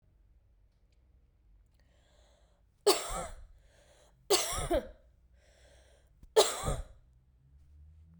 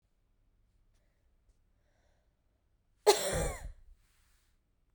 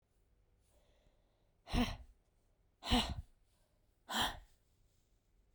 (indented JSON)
{
  "three_cough_length": "8.2 s",
  "three_cough_amplitude": 11649,
  "three_cough_signal_mean_std_ratio": 0.3,
  "cough_length": "4.9 s",
  "cough_amplitude": 10683,
  "cough_signal_mean_std_ratio": 0.23,
  "exhalation_length": "5.5 s",
  "exhalation_amplitude": 3463,
  "exhalation_signal_mean_std_ratio": 0.31,
  "survey_phase": "beta (2021-08-13 to 2022-03-07)",
  "age": "18-44",
  "gender": "Female",
  "wearing_mask": "No",
  "symptom_cough_any": true,
  "symptom_new_continuous_cough": true,
  "symptom_runny_or_blocked_nose": true,
  "symptom_shortness_of_breath": true,
  "symptom_sore_throat": true,
  "symptom_onset": "3 days",
  "smoker_status": "Never smoked",
  "respiratory_condition_asthma": false,
  "respiratory_condition_other": false,
  "recruitment_source": "Test and Trace",
  "submission_delay": "2 days",
  "covid_test_result": "Negative",
  "covid_test_method": "RT-qPCR"
}